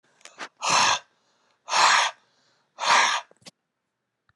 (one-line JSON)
{"exhalation_length": "4.4 s", "exhalation_amplitude": 16064, "exhalation_signal_mean_std_ratio": 0.43, "survey_phase": "alpha (2021-03-01 to 2021-08-12)", "age": "18-44", "gender": "Male", "wearing_mask": "No", "symptom_none": true, "symptom_onset": "12 days", "smoker_status": "Never smoked", "respiratory_condition_asthma": false, "respiratory_condition_other": false, "recruitment_source": "REACT", "submission_delay": "2 days", "covid_test_result": "Negative", "covid_test_method": "RT-qPCR"}